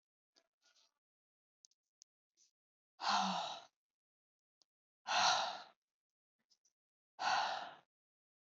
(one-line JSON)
{"exhalation_length": "8.5 s", "exhalation_amplitude": 3119, "exhalation_signal_mean_std_ratio": 0.33, "survey_phase": "beta (2021-08-13 to 2022-03-07)", "age": "45-64", "gender": "Female", "wearing_mask": "No", "symptom_none": true, "smoker_status": "Never smoked", "respiratory_condition_asthma": false, "respiratory_condition_other": false, "recruitment_source": "REACT", "submission_delay": "2 days", "covid_test_result": "Negative", "covid_test_method": "RT-qPCR", "influenza_a_test_result": "Negative", "influenza_b_test_result": "Negative"}